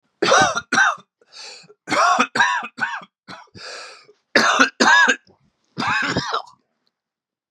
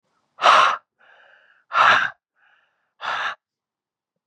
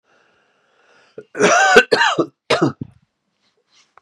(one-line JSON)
{"three_cough_length": "7.5 s", "three_cough_amplitude": 30474, "three_cough_signal_mean_std_ratio": 0.5, "exhalation_length": "4.3 s", "exhalation_amplitude": 29177, "exhalation_signal_mean_std_ratio": 0.36, "cough_length": "4.0 s", "cough_amplitude": 32768, "cough_signal_mean_std_ratio": 0.39, "survey_phase": "beta (2021-08-13 to 2022-03-07)", "age": "45-64", "gender": "Male", "wearing_mask": "No", "symptom_cough_any": true, "symptom_runny_or_blocked_nose": true, "symptom_shortness_of_breath": true, "symptom_sore_throat": true, "symptom_fatigue": true, "symptom_headache": true, "symptom_change_to_sense_of_smell_or_taste": true, "symptom_loss_of_taste": true, "smoker_status": "Never smoked", "respiratory_condition_asthma": false, "respiratory_condition_other": false, "recruitment_source": "Test and Trace", "submission_delay": "1 day", "covid_test_result": "Positive", "covid_test_method": "LFT"}